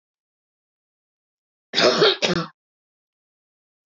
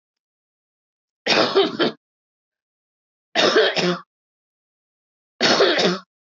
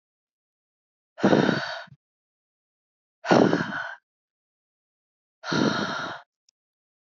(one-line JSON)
{"cough_length": "3.9 s", "cough_amplitude": 22418, "cough_signal_mean_std_ratio": 0.3, "three_cough_length": "6.4 s", "three_cough_amplitude": 24069, "three_cough_signal_mean_std_ratio": 0.42, "exhalation_length": "7.1 s", "exhalation_amplitude": 18835, "exhalation_signal_mean_std_ratio": 0.35, "survey_phase": "beta (2021-08-13 to 2022-03-07)", "age": "18-44", "gender": "Female", "wearing_mask": "No", "symptom_none": true, "smoker_status": "Current smoker (e-cigarettes or vapes only)", "respiratory_condition_asthma": false, "respiratory_condition_other": false, "recruitment_source": "REACT", "submission_delay": "1 day", "covid_test_result": "Negative", "covid_test_method": "RT-qPCR"}